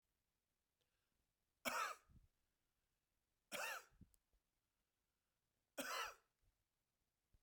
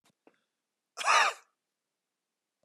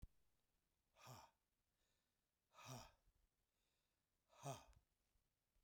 {"three_cough_length": "7.4 s", "three_cough_amplitude": 1384, "three_cough_signal_mean_std_ratio": 0.3, "cough_length": "2.6 s", "cough_amplitude": 7656, "cough_signal_mean_std_ratio": 0.27, "exhalation_length": "5.6 s", "exhalation_amplitude": 346, "exhalation_signal_mean_std_ratio": 0.33, "survey_phase": "beta (2021-08-13 to 2022-03-07)", "age": "65+", "gender": "Male", "wearing_mask": "No", "symptom_runny_or_blocked_nose": true, "symptom_sore_throat": true, "symptom_onset": "8 days", "smoker_status": "Ex-smoker", "respiratory_condition_asthma": false, "respiratory_condition_other": false, "recruitment_source": "REACT", "submission_delay": "1 day", "covid_test_result": "Negative", "covid_test_method": "RT-qPCR", "influenza_a_test_result": "Negative", "influenza_b_test_result": "Negative"}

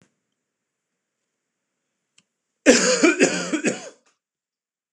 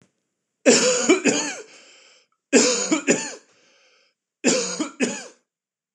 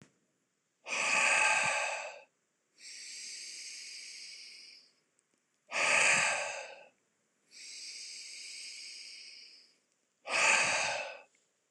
{"cough_length": "4.9 s", "cough_amplitude": 26028, "cough_signal_mean_std_ratio": 0.33, "three_cough_length": "5.9 s", "three_cough_amplitude": 25180, "three_cough_signal_mean_std_ratio": 0.46, "exhalation_length": "11.7 s", "exhalation_amplitude": 5849, "exhalation_signal_mean_std_ratio": 0.49, "survey_phase": "beta (2021-08-13 to 2022-03-07)", "age": "45-64", "gender": "Male", "wearing_mask": "No", "symptom_none": true, "smoker_status": "Never smoked", "respiratory_condition_asthma": false, "respiratory_condition_other": false, "recruitment_source": "REACT", "submission_delay": "2 days", "covid_test_result": "Negative", "covid_test_method": "RT-qPCR"}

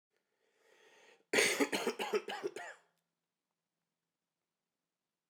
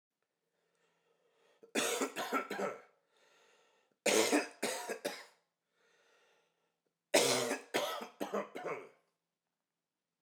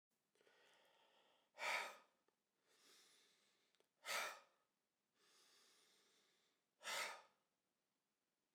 {"cough_length": "5.3 s", "cough_amplitude": 6814, "cough_signal_mean_std_ratio": 0.33, "three_cough_length": "10.2 s", "three_cough_amplitude": 7591, "three_cough_signal_mean_std_ratio": 0.4, "exhalation_length": "8.5 s", "exhalation_amplitude": 812, "exhalation_signal_mean_std_ratio": 0.3, "survey_phase": "beta (2021-08-13 to 2022-03-07)", "age": "18-44", "gender": "Male", "wearing_mask": "No", "symptom_cough_any": true, "symptom_shortness_of_breath": true, "symptom_fatigue": true, "symptom_headache": true, "symptom_change_to_sense_of_smell_or_taste": true, "symptom_loss_of_taste": true, "symptom_onset": "4 days", "smoker_status": "Ex-smoker", "respiratory_condition_asthma": false, "respiratory_condition_other": false, "recruitment_source": "Test and Trace", "submission_delay": "3 days", "covid_test_result": "Positive", "covid_test_method": "RT-qPCR", "covid_ct_value": 14.9, "covid_ct_gene": "N gene", "covid_ct_mean": 15.0, "covid_viral_load": "12000000 copies/ml", "covid_viral_load_category": "High viral load (>1M copies/ml)"}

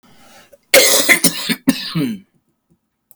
{"cough_length": "3.2 s", "cough_amplitude": 32768, "cough_signal_mean_std_ratio": 0.45, "survey_phase": "beta (2021-08-13 to 2022-03-07)", "age": "45-64", "gender": "Male", "wearing_mask": "No", "symptom_cough_any": true, "symptom_shortness_of_breath": true, "symptom_fatigue": true, "symptom_onset": "12 days", "smoker_status": "Ex-smoker", "respiratory_condition_asthma": true, "respiratory_condition_other": false, "recruitment_source": "REACT", "submission_delay": "3 days", "covid_test_result": "Negative", "covid_test_method": "RT-qPCR", "covid_ct_value": 37.2, "covid_ct_gene": "N gene", "influenza_a_test_result": "Negative", "influenza_b_test_result": "Negative"}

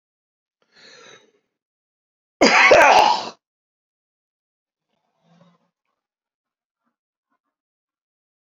{"cough_length": "8.4 s", "cough_amplitude": 29009, "cough_signal_mean_std_ratio": 0.25, "survey_phase": "alpha (2021-03-01 to 2021-08-12)", "age": "45-64", "gender": "Male", "wearing_mask": "No", "symptom_abdominal_pain": true, "symptom_fatigue": true, "smoker_status": "Never smoked", "respiratory_condition_asthma": false, "respiratory_condition_other": true, "recruitment_source": "Test and Trace", "submission_delay": "2 days", "covid_test_result": "Positive", "covid_test_method": "RT-qPCR", "covid_ct_value": 31.6, "covid_ct_gene": "N gene", "covid_ct_mean": 32.4, "covid_viral_load": "24 copies/ml", "covid_viral_load_category": "Minimal viral load (< 10K copies/ml)"}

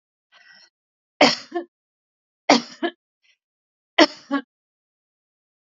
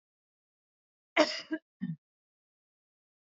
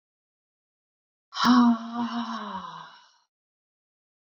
{"three_cough_length": "5.6 s", "three_cough_amplitude": 28674, "three_cough_signal_mean_std_ratio": 0.23, "cough_length": "3.2 s", "cough_amplitude": 9745, "cough_signal_mean_std_ratio": 0.22, "exhalation_length": "4.3 s", "exhalation_amplitude": 11460, "exhalation_signal_mean_std_ratio": 0.38, "survey_phase": "beta (2021-08-13 to 2022-03-07)", "age": "65+", "gender": "Female", "wearing_mask": "No", "symptom_none": true, "smoker_status": "Never smoked", "respiratory_condition_asthma": false, "respiratory_condition_other": false, "recruitment_source": "REACT", "submission_delay": "2 days", "covid_test_result": "Negative", "covid_test_method": "RT-qPCR", "influenza_a_test_result": "Negative", "influenza_b_test_result": "Negative"}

